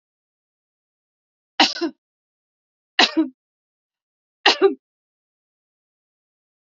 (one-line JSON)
{"three_cough_length": "6.7 s", "three_cough_amplitude": 30461, "three_cough_signal_mean_std_ratio": 0.23, "survey_phase": "beta (2021-08-13 to 2022-03-07)", "age": "65+", "gender": "Female", "wearing_mask": "No", "symptom_none": true, "smoker_status": "Never smoked", "respiratory_condition_asthma": false, "respiratory_condition_other": false, "recruitment_source": "REACT", "submission_delay": "2 days", "covid_test_result": "Negative", "covid_test_method": "RT-qPCR", "influenza_a_test_result": "Negative", "influenza_b_test_result": "Negative"}